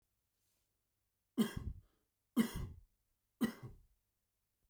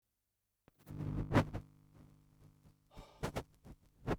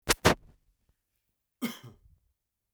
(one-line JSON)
{"three_cough_length": "4.7 s", "three_cough_amplitude": 2825, "three_cough_signal_mean_std_ratio": 0.28, "exhalation_length": "4.2 s", "exhalation_amplitude": 4856, "exhalation_signal_mean_std_ratio": 0.35, "cough_length": "2.7 s", "cough_amplitude": 15210, "cough_signal_mean_std_ratio": 0.22, "survey_phase": "beta (2021-08-13 to 2022-03-07)", "age": "45-64", "gender": "Male", "wearing_mask": "No", "symptom_none": true, "smoker_status": "Ex-smoker", "respiratory_condition_asthma": false, "respiratory_condition_other": false, "recruitment_source": "REACT", "submission_delay": "7 days", "covid_test_result": "Negative", "covid_test_method": "RT-qPCR"}